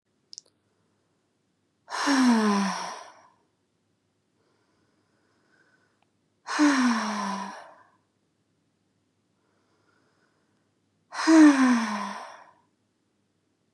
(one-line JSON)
{"exhalation_length": "13.7 s", "exhalation_amplitude": 15885, "exhalation_signal_mean_std_ratio": 0.35, "survey_phase": "beta (2021-08-13 to 2022-03-07)", "age": "18-44", "gender": "Female", "wearing_mask": "No", "symptom_sore_throat": true, "smoker_status": "Never smoked", "respiratory_condition_asthma": false, "respiratory_condition_other": false, "recruitment_source": "Test and Trace", "submission_delay": "2 days", "covid_test_result": "Positive", "covid_test_method": "RT-qPCR", "covid_ct_value": 26.1, "covid_ct_gene": "N gene"}